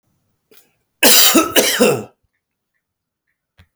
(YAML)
cough_length: 3.8 s
cough_amplitude: 32768
cough_signal_mean_std_ratio: 0.39
survey_phase: beta (2021-08-13 to 2022-03-07)
age: 45-64
gender: Male
wearing_mask: 'No'
symptom_none: true
smoker_status: Ex-smoker
respiratory_condition_asthma: false
respiratory_condition_other: false
recruitment_source: REACT
submission_delay: 0 days
covid_test_result: Negative
covid_test_method: RT-qPCR